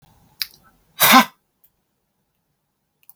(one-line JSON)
{"exhalation_length": "3.2 s", "exhalation_amplitude": 32768, "exhalation_signal_mean_std_ratio": 0.22, "survey_phase": "beta (2021-08-13 to 2022-03-07)", "age": "65+", "gender": "Male", "wearing_mask": "No", "symptom_none": true, "smoker_status": "Never smoked", "respiratory_condition_asthma": false, "respiratory_condition_other": false, "recruitment_source": "REACT", "submission_delay": "2 days", "covid_test_result": "Negative", "covid_test_method": "RT-qPCR", "influenza_a_test_result": "Unknown/Void", "influenza_b_test_result": "Unknown/Void"}